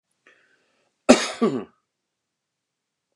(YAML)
cough_length: 3.2 s
cough_amplitude: 29204
cough_signal_mean_std_ratio: 0.22
survey_phase: beta (2021-08-13 to 2022-03-07)
age: 65+
gender: Male
wearing_mask: 'No'
symptom_none: true
smoker_status: Ex-smoker
respiratory_condition_asthma: false
respiratory_condition_other: false
recruitment_source: REACT
submission_delay: 1 day
covid_test_result: Negative
covid_test_method: RT-qPCR
influenza_a_test_result: Negative
influenza_b_test_result: Negative